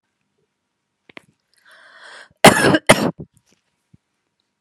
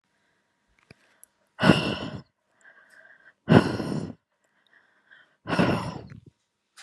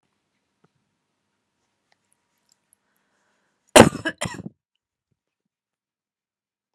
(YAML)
cough_length: 4.6 s
cough_amplitude: 32768
cough_signal_mean_std_ratio: 0.24
exhalation_length: 6.8 s
exhalation_amplitude: 27462
exhalation_signal_mean_std_ratio: 0.31
three_cough_length: 6.7 s
three_cough_amplitude: 32768
three_cough_signal_mean_std_ratio: 0.12
survey_phase: beta (2021-08-13 to 2022-03-07)
age: 45-64
gender: Female
wearing_mask: 'No'
symptom_none: true
smoker_status: Current smoker (1 to 10 cigarettes per day)
respiratory_condition_asthma: false
respiratory_condition_other: false
recruitment_source: REACT
submission_delay: 6 days
covid_test_result: Negative
covid_test_method: RT-qPCR